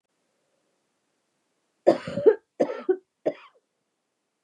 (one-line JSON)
{"three_cough_length": "4.4 s", "three_cough_amplitude": 20901, "three_cough_signal_mean_std_ratio": 0.25, "survey_phase": "beta (2021-08-13 to 2022-03-07)", "age": "45-64", "gender": "Female", "wearing_mask": "No", "symptom_cough_any": true, "symptom_runny_or_blocked_nose": true, "smoker_status": "Never smoked", "respiratory_condition_asthma": false, "respiratory_condition_other": false, "recruitment_source": "Test and Trace", "submission_delay": "2 days", "covid_test_result": "Positive", "covid_test_method": "RT-qPCR", "covid_ct_value": 14.6, "covid_ct_gene": "ORF1ab gene", "covid_ct_mean": 15.0, "covid_viral_load": "12000000 copies/ml", "covid_viral_load_category": "High viral load (>1M copies/ml)"}